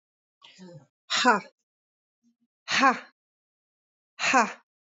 {"exhalation_length": "4.9 s", "exhalation_amplitude": 16179, "exhalation_signal_mean_std_ratio": 0.31, "survey_phase": "alpha (2021-03-01 to 2021-08-12)", "age": "45-64", "gender": "Female", "wearing_mask": "No", "symptom_none": true, "smoker_status": "Current smoker (11 or more cigarettes per day)", "respiratory_condition_asthma": false, "respiratory_condition_other": false, "recruitment_source": "REACT", "submission_delay": "1 day", "covid_test_result": "Negative", "covid_test_method": "RT-qPCR"}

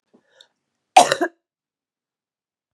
{"cough_length": "2.7 s", "cough_amplitude": 32768, "cough_signal_mean_std_ratio": 0.19, "survey_phase": "beta (2021-08-13 to 2022-03-07)", "age": "18-44", "gender": "Female", "wearing_mask": "No", "symptom_cough_any": true, "symptom_fatigue": true, "symptom_onset": "12 days", "smoker_status": "Never smoked", "respiratory_condition_asthma": false, "respiratory_condition_other": false, "recruitment_source": "REACT", "submission_delay": "3 days", "covid_test_result": "Negative", "covid_test_method": "RT-qPCR", "influenza_a_test_result": "Negative", "influenza_b_test_result": "Negative"}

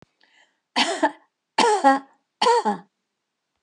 {"three_cough_length": "3.6 s", "three_cough_amplitude": 23405, "three_cough_signal_mean_std_ratio": 0.42, "survey_phase": "alpha (2021-03-01 to 2021-08-12)", "age": "65+", "gender": "Female", "wearing_mask": "No", "symptom_none": true, "smoker_status": "Never smoked", "respiratory_condition_asthma": false, "respiratory_condition_other": false, "recruitment_source": "REACT", "submission_delay": "2 days", "covid_test_result": "Negative", "covid_test_method": "RT-qPCR"}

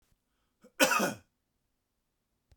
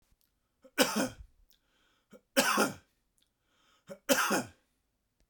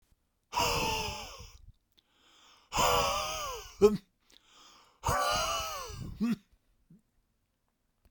{"cough_length": "2.6 s", "cough_amplitude": 12362, "cough_signal_mean_std_ratio": 0.27, "three_cough_length": "5.3 s", "three_cough_amplitude": 13407, "three_cough_signal_mean_std_ratio": 0.34, "exhalation_length": "8.1 s", "exhalation_amplitude": 10685, "exhalation_signal_mean_std_ratio": 0.47, "survey_phase": "beta (2021-08-13 to 2022-03-07)", "age": "45-64", "gender": "Male", "wearing_mask": "No", "symptom_fatigue": true, "smoker_status": "Never smoked", "respiratory_condition_asthma": true, "respiratory_condition_other": false, "recruitment_source": "REACT", "submission_delay": "1 day", "covid_test_result": "Negative", "covid_test_method": "RT-qPCR"}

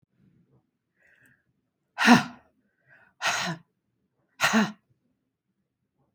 {"exhalation_length": "6.1 s", "exhalation_amplitude": 25498, "exhalation_signal_mean_std_ratio": 0.26, "survey_phase": "beta (2021-08-13 to 2022-03-07)", "age": "65+", "gender": "Female", "wearing_mask": "No", "symptom_none": true, "smoker_status": "Never smoked", "respiratory_condition_asthma": false, "respiratory_condition_other": false, "recruitment_source": "REACT", "submission_delay": "1 day", "covid_test_result": "Negative", "covid_test_method": "RT-qPCR"}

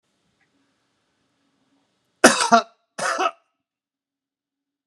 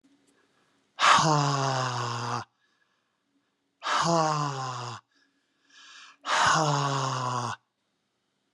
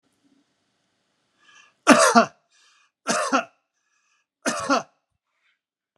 {"cough_length": "4.9 s", "cough_amplitude": 32768, "cough_signal_mean_std_ratio": 0.23, "exhalation_length": "8.5 s", "exhalation_amplitude": 14388, "exhalation_signal_mean_std_ratio": 0.53, "three_cough_length": "6.0 s", "three_cough_amplitude": 32767, "three_cough_signal_mean_std_ratio": 0.29, "survey_phase": "beta (2021-08-13 to 2022-03-07)", "age": "45-64", "gender": "Male", "wearing_mask": "No", "symptom_none": true, "smoker_status": "Current smoker (e-cigarettes or vapes only)", "respiratory_condition_asthma": false, "respiratory_condition_other": false, "recruitment_source": "REACT", "submission_delay": "3 days", "covid_test_result": "Negative", "covid_test_method": "RT-qPCR"}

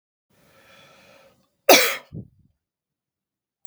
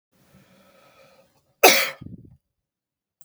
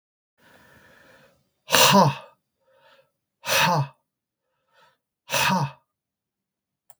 {"cough_length": "3.7 s", "cough_amplitude": 32768, "cough_signal_mean_std_ratio": 0.21, "three_cough_length": "3.2 s", "three_cough_amplitude": 32768, "three_cough_signal_mean_std_ratio": 0.22, "exhalation_length": "7.0 s", "exhalation_amplitude": 32766, "exhalation_signal_mean_std_ratio": 0.33, "survey_phase": "beta (2021-08-13 to 2022-03-07)", "age": "45-64", "gender": "Male", "wearing_mask": "No", "symptom_none": true, "symptom_onset": "12 days", "smoker_status": "Ex-smoker", "respiratory_condition_asthma": false, "respiratory_condition_other": false, "recruitment_source": "REACT", "submission_delay": "1 day", "covid_test_result": "Negative", "covid_test_method": "RT-qPCR", "influenza_a_test_result": "Negative", "influenza_b_test_result": "Negative"}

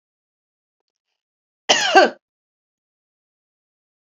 {"cough_length": "4.2 s", "cough_amplitude": 29820, "cough_signal_mean_std_ratio": 0.22, "survey_phase": "beta (2021-08-13 to 2022-03-07)", "age": "45-64", "gender": "Female", "wearing_mask": "No", "symptom_none": true, "smoker_status": "Ex-smoker", "respiratory_condition_asthma": false, "respiratory_condition_other": false, "recruitment_source": "REACT", "submission_delay": "2 days", "covid_test_result": "Negative", "covid_test_method": "RT-qPCR"}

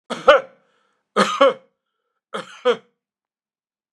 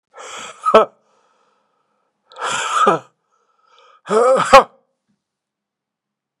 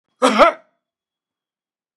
{"three_cough_length": "3.9 s", "three_cough_amplitude": 32767, "three_cough_signal_mean_std_ratio": 0.3, "exhalation_length": "6.4 s", "exhalation_amplitude": 32768, "exhalation_signal_mean_std_ratio": 0.33, "cough_length": "2.0 s", "cough_amplitude": 32767, "cough_signal_mean_std_ratio": 0.29, "survey_phase": "beta (2021-08-13 to 2022-03-07)", "age": "65+", "gender": "Male", "wearing_mask": "No", "symptom_none": true, "symptom_onset": "9 days", "smoker_status": "Ex-smoker", "respiratory_condition_asthma": false, "respiratory_condition_other": false, "recruitment_source": "REACT", "submission_delay": "1 day", "covid_test_result": "Positive", "covid_test_method": "RT-qPCR", "covid_ct_value": 32.0, "covid_ct_gene": "N gene", "influenza_a_test_result": "Negative", "influenza_b_test_result": "Negative"}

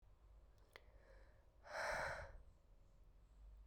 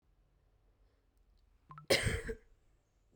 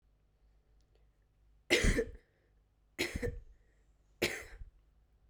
{"exhalation_length": "3.7 s", "exhalation_amplitude": 732, "exhalation_signal_mean_std_ratio": 0.54, "cough_length": "3.2 s", "cough_amplitude": 5412, "cough_signal_mean_std_ratio": 0.29, "three_cough_length": "5.3 s", "three_cough_amplitude": 6022, "three_cough_signal_mean_std_ratio": 0.33, "survey_phase": "beta (2021-08-13 to 2022-03-07)", "age": "18-44", "gender": "Female", "wearing_mask": "No", "symptom_shortness_of_breath": true, "symptom_abdominal_pain": true, "symptom_fatigue": true, "symptom_fever_high_temperature": true, "symptom_headache": true, "symptom_change_to_sense_of_smell_or_taste": true, "symptom_loss_of_taste": true, "symptom_other": true, "smoker_status": "Current smoker (1 to 10 cigarettes per day)", "respiratory_condition_asthma": false, "respiratory_condition_other": false, "recruitment_source": "Test and Trace", "submission_delay": "1 day", "covid_test_result": "Positive", "covid_test_method": "RT-qPCR", "covid_ct_value": 18.8, "covid_ct_gene": "ORF1ab gene", "covid_ct_mean": 19.9, "covid_viral_load": "290000 copies/ml", "covid_viral_load_category": "Low viral load (10K-1M copies/ml)"}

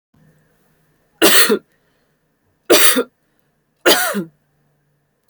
{"three_cough_length": "5.3 s", "three_cough_amplitude": 32768, "three_cough_signal_mean_std_ratio": 0.35, "survey_phase": "beta (2021-08-13 to 2022-03-07)", "age": "18-44", "gender": "Female", "wearing_mask": "No", "symptom_none": true, "smoker_status": "Never smoked", "respiratory_condition_asthma": false, "respiratory_condition_other": false, "recruitment_source": "REACT", "submission_delay": "11 days", "covid_test_result": "Negative", "covid_test_method": "RT-qPCR"}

